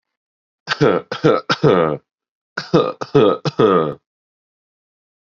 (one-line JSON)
{"three_cough_length": "5.2 s", "three_cough_amplitude": 30720, "three_cough_signal_mean_std_ratio": 0.45, "survey_phase": "beta (2021-08-13 to 2022-03-07)", "age": "18-44", "gender": "Male", "wearing_mask": "No", "symptom_runny_or_blocked_nose": true, "symptom_sore_throat": true, "symptom_other": true, "smoker_status": "Current smoker (1 to 10 cigarettes per day)", "respiratory_condition_asthma": false, "respiratory_condition_other": false, "recruitment_source": "Test and Trace", "submission_delay": "1 day", "covid_test_result": "Positive", "covid_test_method": "RT-qPCR", "covid_ct_value": 21.6, "covid_ct_gene": "ORF1ab gene"}